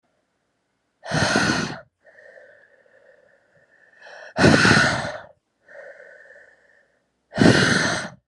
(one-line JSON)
{"exhalation_length": "8.3 s", "exhalation_amplitude": 30373, "exhalation_signal_mean_std_ratio": 0.4, "survey_phase": "alpha (2021-03-01 to 2021-08-12)", "age": "18-44", "gender": "Female", "wearing_mask": "No", "symptom_cough_any": true, "symptom_shortness_of_breath": true, "symptom_fatigue": true, "symptom_headache": true, "symptom_onset": "3 days", "smoker_status": "Never smoked", "respiratory_condition_asthma": true, "respiratory_condition_other": false, "recruitment_source": "Test and Trace", "submission_delay": "2 days", "covid_test_result": "Positive", "covid_test_method": "RT-qPCR"}